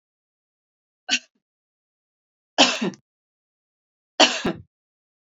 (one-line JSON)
{"three_cough_length": "5.4 s", "three_cough_amplitude": 30843, "three_cough_signal_mean_std_ratio": 0.24, "survey_phase": "alpha (2021-03-01 to 2021-08-12)", "age": "45-64", "gender": "Female", "wearing_mask": "No", "symptom_none": true, "smoker_status": "Never smoked", "respiratory_condition_asthma": false, "respiratory_condition_other": false, "recruitment_source": "REACT", "submission_delay": "1 day", "covid_test_result": "Negative", "covid_test_method": "RT-qPCR", "covid_ct_value": 41.0, "covid_ct_gene": "N gene"}